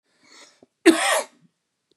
{
  "cough_length": "2.0 s",
  "cough_amplitude": 28312,
  "cough_signal_mean_std_ratio": 0.31,
  "survey_phase": "beta (2021-08-13 to 2022-03-07)",
  "age": "18-44",
  "gender": "Male",
  "wearing_mask": "No",
  "symptom_none": true,
  "smoker_status": "Current smoker (11 or more cigarettes per day)",
  "respiratory_condition_asthma": false,
  "respiratory_condition_other": false,
  "recruitment_source": "REACT",
  "submission_delay": "2 days",
  "covid_test_result": "Negative",
  "covid_test_method": "RT-qPCR",
  "influenza_a_test_result": "Negative",
  "influenza_b_test_result": "Negative"
}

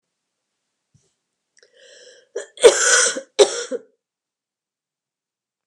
{
  "cough_length": "5.7 s",
  "cough_amplitude": 32768,
  "cough_signal_mean_std_ratio": 0.26,
  "survey_phase": "beta (2021-08-13 to 2022-03-07)",
  "age": "45-64",
  "gender": "Female",
  "wearing_mask": "No",
  "symptom_cough_any": true,
  "symptom_fatigue": true,
  "symptom_headache": true,
  "symptom_onset": "4 days",
  "smoker_status": "Prefer not to say",
  "respiratory_condition_asthma": false,
  "respiratory_condition_other": false,
  "recruitment_source": "Test and Trace",
  "submission_delay": "2 days",
  "covid_test_result": "Positive",
  "covid_test_method": "RT-qPCR",
  "covid_ct_value": 18.0,
  "covid_ct_gene": "ORF1ab gene",
  "covid_ct_mean": 18.2,
  "covid_viral_load": "1100000 copies/ml",
  "covid_viral_load_category": "High viral load (>1M copies/ml)"
}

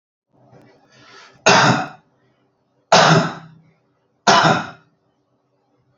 {
  "three_cough_length": "6.0 s",
  "three_cough_amplitude": 30869,
  "three_cough_signal_mean_std_ratio": 0.36,
  "survey_phase": "beta (2021-08-13 to 2022-03-07)",
  "age": "45-64",
  "gender": "Male",
  "wearing_mask": "No",
  "symptom_none": true,
  "smoker_status": "Ex-smoker",
  "respiratory_condition_asthma": false,
  "respiratory_condition_other": false,
  "recruitment_source": "REACT",
  "submission_delay": "3 days",
  "covid_test_result": "Negative",
  "covid_test_method": "RT-qPCR",
  "influenza_a_test_result": "Negative",
  "influenza_b_test_result": "Negative"
}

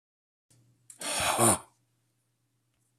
{
  "exhalation_length": "3.0 s",
  "exhalation_amplitude": 10509,
  "exhalation_signal_mean_std_ratio": 0.33,
  "survey_phase": "alpha (2021-03-01 to 2021-08-12)",
  "age": "65+",
  "gender": "Male",
  "wearing_mask": "No",
  "symptom_none": true,
  "smoker_status": "Ex-smoker",
  "respiratory_condition_asthma": false,
  "respiratory_condition_other": false,
  "recruitment_source": "REACT",
  "submission_delay": "2 days",
  "covid_test_result": "Negative",
  "covid_test_method": "RT-qPCR"
}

